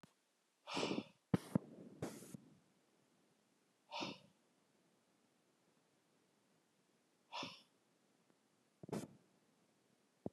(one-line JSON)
{"exhalation_length": "10.3 s", "exhalation_amplitude": 3226, "exhalation_signal_mean_std_ratio": 0.26, "survey_phase": "beta (2021-08-13 to 2022-03-07)", "age": "65+", "gender": "Male", "wearing_mask": "No", "symptom_fatigue": true, "smoker_status": "Never smoked", "respiratory_condition_asthma": false, "respiratory_condition_other": false, "recruitment_source": "REACT", "submission_delay": "1 day", "covid_test_result": "Negative", "covid_test_method": "RT-qPCR", "influenza_a_test_result": "Negative", "influenza_b_test_result": "Negative"}